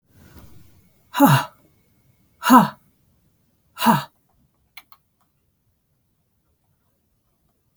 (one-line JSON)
{"exhalation_length": "7.8 s", "exhalation_amplitude": 32768, "exhalation_signal_mean_std_ratio": 0.24, "survey_phase": "beta (2021-08-13 to 2022-03-07)", "age": "45-64", "gender": "Female", "wearing_mask": "No", "symptom_none": true, "smoker_status": "Never smoked", "respiratory_condition_asthma": false, "respiratory_condition_other": false, "recruitment_source": "REACT", "submission_delay": "3 days", "covid_test_result": "Negative", "covid_test_method": "RT-qPCR", "influenza_a_test_result": "Negative", "influenza_b_test_result": "Negative"}